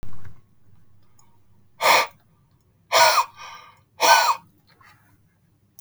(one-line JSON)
{"exhalation_length": "5.8 s", "exhalation_amplitude": 27489, "exhalation_signal_mean_std_ratio": 0.39, "survey_phase": "beta (2021-08-13 to 2022-03-07)", "age": "18-44", "gender": "Male", "wearing_mask": "No", "symptom_none": true, "smoker_status": "Never smoked", "respiratory_condition_asthma": false, "respiratory_condition_other": false, "recruitment_source": "REACT", "submission_delay": "1 day", "covid_test_result": "Negative", "covid_test_method": "RT-qPCR", "influenza_a_test_result": "Negative", "influenza_b_test_result": "Negative"}